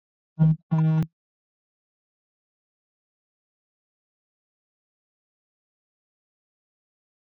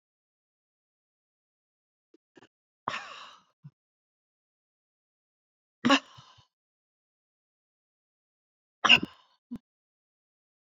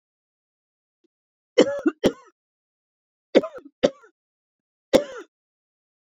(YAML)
cough_length: 7.3 s
cough_amplitude: 11166
cough_signal_mean_std_ratio: 0.23
exhalation_length: 10.8 s
exhalation_amplitude: 17826
exhalation_signal_mean_std_ratio: 0.14
three_cough_length: 6.1 s
three_cough_amplitude: 26289
three_cough_signal_mean_std_ratio: 0.22
survey_phase: beta (2021-08-13 to 2022-03-07)
age: 65+
gender: Female
wearing_mask: 'No'
symptom_none: true
smoker_status: Ex-smoker
respiratory_condition_asthma: false
respiratory_condition_other: false
recruitment_source: REACT
submission_delay: 3 days
covid_test_result: Negative
covid_test_method: RT-qPCR
influenza_a_test_result: Negative
influenza_b_test_result: Negative